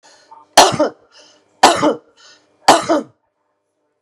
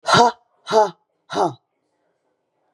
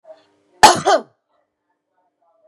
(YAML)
three_cough_length: 4.0 s
three_cough_amplitude: 32768
three_cough_signal_mean_std_ratio: 0.35
exhalation_length: 2.7 s
exhalation_amplitude: 32556
exhalation_signal_mean_std_ratio: 0.36
cough_length: 2.5 s
cough_amplitude: 32768
cough_signal_mean_std_ratio: 0.26
survey_phase: beta (2021-08-13 to 2022-03-07)
age: 45-64
gender: Female
wearing_mask: 'No'
symptom_runny_or_blocked_nose: true
symptom_sore_throat: true
symptom_fatigue: true
symptom_headache: true
smoker_status: Ex-smoker
respiratory_condition_asthma: false
respiratory_condition_other: false
recruitment_source: Test and Trace
submission_delay: 1 day
covid_test_result: Positive
covid_test_method: RT-qPCR
covid_ct_value: 29.2
covid_ct_gene: ORF1ab gene